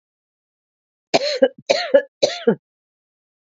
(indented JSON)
{
  "three_cough_length": "3.5 s",
  "three_cough_amplitude": 32767,
  "three_cough_signal_mean_std_ratio": 0.33,
  "survey_phase": "alpha (2021-03-01 to 2021-08-12)",
  "age": "45-64",
  "gender": "Female",
  "wearing_mask": "No",
  "symptom_shortness_of_breath": true,
  "smoker_status": "Prefer not to say",
  "recruitment_source": "REACT",
  "submission_delay": "1 day",
  "covid_test_result": "Negative",
  "covid_test_method": "RT-qPCR"
}